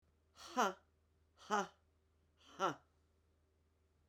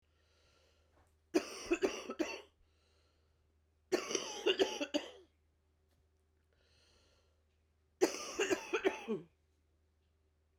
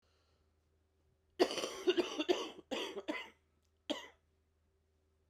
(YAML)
exhalation_length: 4.1 s
exhalation_amplitude: 2868
exhalation_signal_mean_std_ratio: 0.27
three_cough_length: 10.6 s
three_cough_amplitude: 4269
three_cough_signal_mean_std_ratio: 0.35
cough_length: 5.3 s
cough_amplitude: 5629
cough_signal_mean_std_ratio: 0.36
survey_phase: beta (2021-08-13 to 2022-03-07)
age: 45-64
gender: Female
wearing_mask: 'No'
symptom_cough_any: true
symptom_runny_or_blocked_nose: true
symptom_sore_throat: true
symptom_fatigue: true
symptom_headache: true
symptom_change_to_sense_of_smell_or_taste: true
symptom_onset: 3 days
smoker_status: Current smoker (11 or more cigarettes per day)
respiratory_condition_asthma: false
respiratory_condition_other: false
recruitment_source: Test and Trace
submission_delay: 1 day
covid_test_result: Negative
covid_test_method: RT-qPCR